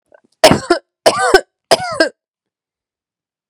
{"three_cough_length": "3.5 s", "three_cough_amplitude": 32768, "three_cough_signal_mean_std_ratio": 0.35, "survey_phase": "beta (2021-08-13 to 2022-03-07)", "age": "18-44", "gender": "Female", "wearing_mask": "No", "symptom_cough_any": true, "symptom_runny_or_blocked_nose": true, "symptom_fatigue": true, "symptom_headache": true, "symptom_onset": "3 days", "smoker_status": "Never smoked", "respiratory_condition_asthma": false, "respiratory_condition_other": false, "recruitment_source": "Test and Trace", "submission_delay": "2 days", "covid_test_result": "Positive", "covid_test_method": "ePCR"}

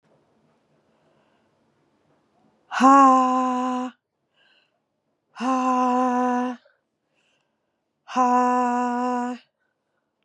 {"exhalation_length": "10.2 s", "exhalation_amplitude": 26661, "exhalation_signal_mean_std_ratio": 0.45, "survey_phase": "beta (2021-08-13 to 2022-03-07)", "age": "18-44", "gender": "Female", "wearing_mask": "No", "symptom_cough_any": true, "symptom_runny_or_blocked_nose": true, "symptom_shortness_of_breath": true, "symptom_fatigue": true, "symptom_headache": true, "symptom_change_to_sense_of_smell_or_taste": true, "symptom_loss_of_taste": true, "symptom_onset": "3 days", "smoker_status": "Never smoked", "respiratory_condition_asthma": true, "respiratory_condition_other": false, "recruitment_source": "Test and Trace", "submission_delay": "2 days", "covid_test_result": "Positive", "covid_test_method": "RT-qPCR", "covid_ct_value": 21.2, "covid_ct_gene": "ORF1ab gene", "covid_ct_mean": 22.0, "covid_viral_load": "60000 copies/ml", "covid_viral_load_category": "Low viral load (10K-1M copies/ml)"}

